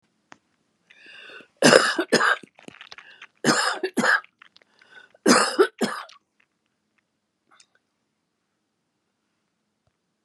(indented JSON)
{
  "three_cough_length": "10.2 s",
  "three_cough_amplitude": 32768,
  "three_cough_signal_mean_std_ratio": 0.31,
  "survey_phase": "beta (2021-08-13 to 2022-03-07)",
  "age": "65+",
  "gender": "Female",
  "wearing_mask": "No",
  "symptom_cough_any": true,
  "symptom_runny_or_blocked_nose": true,
  "symptom_shortness_of_breath": true,
  "symptom_sore_throat": true,
  "symptom_diarrhoea": true,
  "smoker_status": "Ex-smoker",
  "respiratory_condition_asthma": true,
  "respiratory_condition_other": false,
  "recruitment_source": "Test and Trace",
  "submission_delay": "3 days",
  "covid_test_result": "Positive",
  "covid_test_method": "RT-qPCR",
  "covid_ct_value": 17.2,
  "covid_ct_gene": "N gene",
  "covid_ct_mean": 17.4,
  "covid_viral_load": "2000000 copies/ml",
  "covid_viral_load_category": "High viral load (>1M copies/ml)"
}